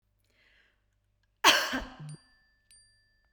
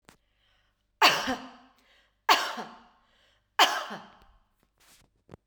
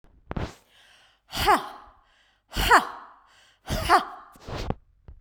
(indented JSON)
{
  "cough_length": "3.3 s",
  "cough_amplitude": 16514,
  "cough_signal_mean_std_ratio": 0.25,
  "three_cough_length": "5.5 s",
  "three_cough_amplitude": 17750,
  "three_cough_signal_mean_std_ratio": 0.29,
  "exhalation_length": "5.2 s",
  "exhalation_amplitude": 23681,
  "exhalation_signal_mean_std_ratio": 0.36,
  "survey_phase": "beta (2021-08-13 to 2022-03-07)",
  "age": "45-64",
  "gender": "Female",
  "wearing_mask": "No",
  "symptom_none": true,
  "smoker_status": "Never smoked",
  "respiratory_condition_asthma": false,
  "respiratory_condition_other": false,
  "recruitment_source": "REACT",
  "submission_delay": "1 day",
  "covid_test_result": "Negative",
  "covid_test_method": "RT-qPCR",
  "influenza_a_test_result": "Negative",
  "influenza_b_test_result": "Negative"
}